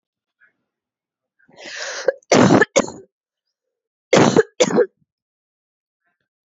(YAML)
cough_length: 6.5 s
cough_amplitude: 30755
cough_signal_mean_std_ratio: 0.32
survey_phase: beta (2021-08-13 to 2022-03-07)
age: 18-44
gender: Female
wearing_mask: 'No'
symptom_cough_any: true
symptom_runny_or_blocked_nose: true
symptom_sore_throat: true
symptom_fatigue: true
symptom_headache: true
symptom_onset: 5 days
smoker_status: Ex-smoker
respiratory_condition_asthma: true
respiratory_condition_other: false
recruitment_source: Test and Trace
submission_delay: 1 day
covid_test_result: Positive
covid_test_method: RT-qPCR